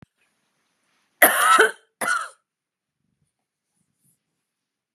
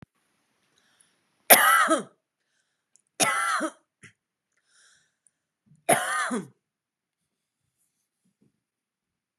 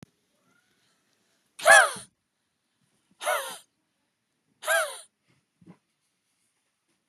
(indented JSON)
{
  "cough_length": "4.9 s",
  "cough_amplitude": 32756,
  "cough_signal_mean_std_ratio": 0.28,
  "three_cough_length": "9.4 s",
  "three_cough_amplitude": 32691,
  "three_cough_signal_mean_std_ratio": 0.28,
  "exhalation_length": "7.1 s",
  "exhalation_amplitude": 24034,
  "exhalation_signal_mean_std_ratio": 0.22,
  "survey_phase": "beta (2021-08-13 to 2022-03-07)",
  "age": "45-64",
  "gender": "Female",
  "wearing_mask": "No",
  "symptom_runny_or_blocked_nose": true,
  "symptom_headache": true,
  "symptom_onset": "13 days",
  "smoker_status": "Never smoked",
  "respiratory_condition_asthma": false,
  "respiratory_condition_other": false,
  "recruitment_source": "REACT",
  "submission_delay": "1 day",
  "covid_test_result": "Negative",
  "covid_test_method": "RT-qPCR",
  "influenza_a_test_result": "Negative",
  "influenza_b_test_result": "Negative"
}